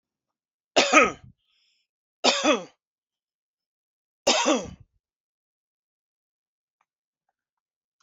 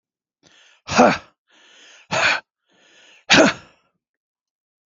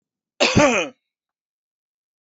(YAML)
three_cough_length: 8.0 s
three_cough_amplitude: 27546
three_cough_signal_mean_std_ratio: 0.27
exhalation_length: 4.9 s
exhalation_amplitude: 29837
exhalation_signal_mean_std_ratio: 0.31
cough_length: 2.2 s
cough_amplitude: 25654
cough_signal_mean_std_ratio: 0.35
survey_phase: beta (2021-08-13 to 2022-03-07)
age: 45-64
gender: Male
wearing_mask: 'No'
symptom_none: true
smoker_status: Never smoked
respiratory_condition_asthma: true
respiratory_condition_other: false
recruitment_source: REACT
submission_delay: 3 days
covid_test_result: Negative
covid_test_method: RT-qPCR